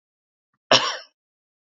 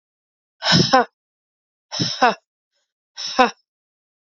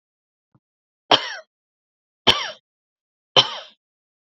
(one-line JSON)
{"cough_length": "1.7 s", "cough_amplitude": 29069, "cough_signal_mean_std_ratio": 0.25, "exhalation_length": "4.4 s", "exhalation_amplitude": 27852, "exhalation_signal_mean_std_ratio": 0.33, "three_cough_length": "4.3 s", "three_cough_amplitude": 31067, "three_cough_signal_mean_std_ratio": 0.22, "survey_phase": "beta (2021-08-13 to 2022-03-07)", "age": "18-44", "gender": "Female", "wearing_mask": "No", "symptom_cough_any": true, "symptom_runny_or_blocked_nose": true, "symptom_sore_throat": true, "symptom_diarrhoea": true, "symptom_fatigue": true, "symptom_headache": true, "symptom_onset": "3 days", "smoker_status": "Never smoked", "respiratory_condition_asthma": false, "respiratory_condition_other": false, "recruitment_source": "Test and Trace", "submission_delay": "1 day", "covid_test_result": "Positive", "covid_test_method": "RT-qPCR", "covid_ct_value": 17.9, "covid_ct_gene": "ORF1ab gene", "covid_ct_mean": 18.3, "covid_viral_load": "990000 copies/ml", "covid_viral_load_category": "Low viral load (10K-1M copies/ml)"}